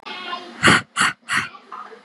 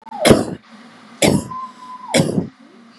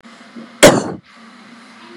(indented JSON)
{
  "exhalation_length": "2.0 s",
  "exhalation_amplitude": 32560,
  "exhalation_signal_mean_std_ratio": 0.48,
  "three_cough_length": "3.0 s",
  "three_cough_amplitude": 32768,
  "three_cough_signal_mean_std_ratio": 0.46,
  "cough_length": "2.0 s",
  "cough_amplitude": 32768,
  "cough_signal_mean_std_ratio": 0.3,
  "survey_phase": "beta (2021-08-13 to 2022-03-07)",
  "age": "18-44",
  "gender": "Female",
  "wearing_mask": "No",
  "symptom_none": true,
  "smoker_status": "Never smoked",
  "respiratory_condition_asthma": false,
  "respiratory_condition_other": false,
  "recruitment_source": "REACT",
  "submission_delay": "1 day",
  "covid_test_result": "Negative",
  "covid_test_method": "RT-qPCR",
  "influenza_a_test_result": "Negative",
  "influenza_b_test_result": "Negative"
}